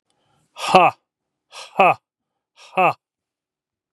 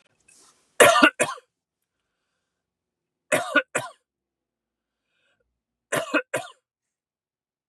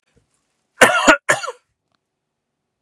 exhalation_length: 3.9 s
exhalation_amplitude: 32768
exhalation_signal_mean_std_ratio: 0.29
three_cough_length: 7.7 s
three_cough_amplitude: 32767
three_cough_signal_mean_std_ratio: 0.25
cough_length: 2.8 s
cough_amplitude: 32768
cough_signal_mean_std_ratio: 0.3
survey_phase: beta (2021-08-13 to 2022-03-07)
age: 45-64
gender: Male
wearing_mask: 'No'
symptom_cough_any: true
symptom_runny_or_blocked_nose: true
symptom_headache: true
symptom_onset: 12 days
smoker_status: Ex-smoker
respiratory_condition_asthma: false
respiratory_condition_other: false
recruitment_source: REACT
submission_delay: 1 day
covid_test_result: Negative
covid_test_method: RT-qPCR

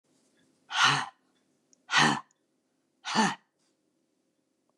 exhalation_length: 4.8 s
exhalation_amplitude: 10813
exhalation_signal_mean_std_ratio: 0.33
survey_phase: beta (2021-08-13 to 2022-03-07)
age: 65+
gender: Female
wearing_mask: 'No'
symptom_none: true
smoker_status: Never smoked
respiratory_condition_asthma: false
respiratory_condition_other: true
recruitment_source: REACT
submission_delay: 1 day
covid_test_result: Negative
covid_test_method: RT-qPCR
influenza_a_test_result: Negative
influenza_b_test_result: Negative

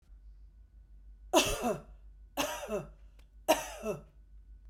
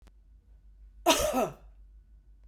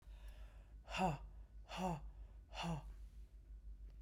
three_cough_length: 4.7 s
three_cough_amplitude: 9392
three_cough_signal_mean_std_ratio: 0.44
cough_length: 2.5 s
cough_amplitude: 14621
cough_signal_mean_std_ratio: 0.38
exhalation_length: 4.0 s
exhalation_amplitude: 1742
exhalation_signal_mean_std_ratio: 0.71
survey_phase: beta (2021-08-13 to 2022-03-07)
age: 45-64
gender: Female
wearing_mask: 'No'
symptom_none: true
smoker_status: Never smoked
respiratory_condition_asthma: false
respiratory_condition_other: false
recruitment_source: REACT
submission_delay: 1 day
covid_test_result: Negative
covid_test_method: RT-qPCR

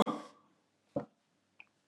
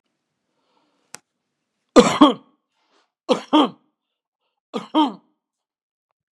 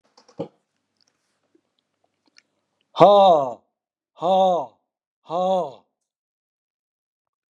cough_length: 1.9 s
cough_amplitude: 6865
cough_signal_mean_std_ratio: 0.25
three_cough_length: 6.3 s
three_cough_amplitude: 32768
three_cough_signal_mean_std_ratio: 0.24
exhalation_length: 7.5 s
exhalation_amplitude: 32768
exhalation_signal_mean_std_ratio: 0.31
survey_phase: beta (2021-08-13 to 2022-03-07)
age: 65+
gender: Male
wearing_mask: 'No'
symptom_none: true
smoker_status: Ex-smoker
respiratory_condition_asthma: false
respiratory_condition_other: false
recruitment_source: REACT
submission_delay: 2 days
covid_test_result: Negative
covid_test_method: RT-qPCR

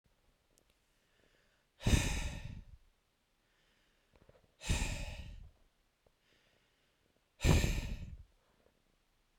exhalation_length: 9.4 s
exhalation_amplitude: 6083
exhalation_signal_mean_std_ratio: 0.32
survey_phase: beta (2021-08-13 to 2022-03-07)
age: 18-44
gender: Male
wearing_mask: 'No'
symptom_none: true
smoker_status: Never smoked
respiratory_condition_asthma: false
respiratory_condition_other: false
recruitment_source: REACT
submission_delay: 2 days
covid_test_result: Negative
covid_test_method: RT-qPCR
influenza_a_test_result: Unknown/Void
influenza_b_test_result: Unknown/Void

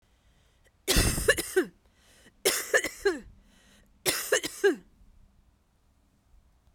three_cough_length: 6.7 s
three_cough_amplitude: 11474
three_cough_signal_mean_std_ratio: 0.39
survey_phase: beta (2021-08-13 to 2022-03-07)
age: 45-64
gender: Female
wearing_mask: 'No'
symptom_cough_any: true
symptom_fatigue: true
smoker_status: Never smoked
respiratory_condition_asthma: false
respiratory_condition_other: false
recruitment_source: Test and Trace
submission_delay: 2 days
covid_test_result: Positive
covid_test_method: RT-qPCR
covid_ct_value: 31.4
covid_ct_gene: ORF1ab gene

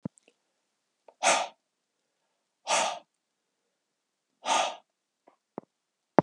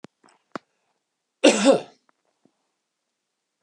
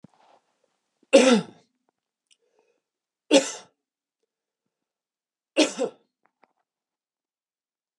exhalation_length: 6.2 s
exhalation_amplitude: 30542
exhalation_signal_mean_std_ratio: 0.26
cough_length: 3.6 s
cough_amplitude: 26450
cough_signal_mean_std_ratio: 0.23
three_cough_length: 8.0 s
three_cough_amplitude: 27068
three_cough_signal_mean_std_ratio: 0.22
survey_phase: beta (2021-08-13 to 2022-03-07)
age: 65+
gender: Male
wearing_mask: 'No'
symptom_none: true
smoker_status: Never smoked
respiratory_condition_asthma: false
respiratory_condition_other: false
recruitment_source: REACT
submission_delay: 3 days
covid_test_result: Negative
covid_test_method: RT-qPCR
influenza_a_test_result: Negative
influenza_b_test_result: Negative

